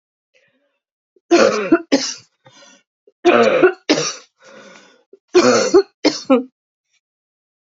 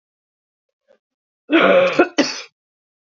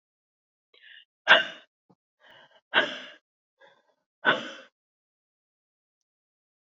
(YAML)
three_cough_length: 7.8 s
three_cough_amplitude: 32668
three_cough_signal_mean_std_ratio: 0.4
cough_length: 3.2 s
cough_amplitude: 27827
cough_signal_mean_std_ratio: 0.38
exhalation_length: 6.7 s
exhalation_amplitude: 23193
exhalation_signal_mean_std_ratio: 0.21
survey_phase: beta (2021-08-13 to 2022-03-07)
age: 45-64
gender: Female
wearing_mask: 'No'
symptom_cough_any: true
symptom_runny_or_blocked_nose: true
symptom_sore_throat: true
symptom_fever_high_temperature: true
symptom_headache: true
symptom_onset: 4 days
smoker_status: Never smoked
respiratory_condition_asthma: false
respiratory_condition_other: false
recruitment_source: Test and Trace
submission_delay: 2 days
covid_test_result: Positive
covid_test_method: ePCR